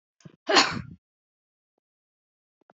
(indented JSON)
{
  "cough_length": "2.7 s",
  "cough_amplitude": 21790,
  "cough_signal_mean_std_ratio": 0.24,
  "survey_phase": "alpha (2021-03-01 to 2021-08-12)",
  "age": "65+",
  "gender": "Female",
  "wearing_mask": "No",
  "symptom_none": true,
  "smoker_status": "Never smoked",
  "respiratory_condition_asthma": false,
  "respiratory_condition_other": false,
  "recruitment_source": "REACT",
  "submission_delay": "3 days",
  "covid_test_result": "Negative",
  "covid_test_method": "RT-qPCR"
}